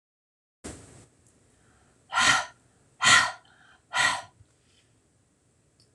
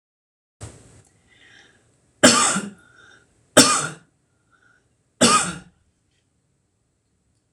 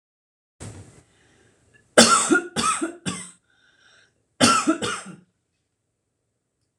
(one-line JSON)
{"exhalation_length": "5.9 s", "exhalation_amplitude": 17806, "exhalation_signal_mean_std_ratio": 0.31, "three_cough_length": "7.5 s", "three_cough_amplitude": 26028, "three_cough_signal_mean_std_ratio": 0.28, "cough_length": "6.8 s", "cough_amplitude": 26028, "cough_signal_mean_std_ratio": 0.34, "survey_phase": "beta (2021-08-13 to 2022-03-07)", "age": "45-64", "gender": "Female", "wearing_mask": "No", "symptom_none": true, "smoker_status": "Never smoked", "respiratory_condition_asthma": false, "respiratory_condition_other": false, "recruitment_source": "REACT", "submission_delay": "0 days", "covid_test_result": "Negative", "covid_test_method": "RT-qPCR"}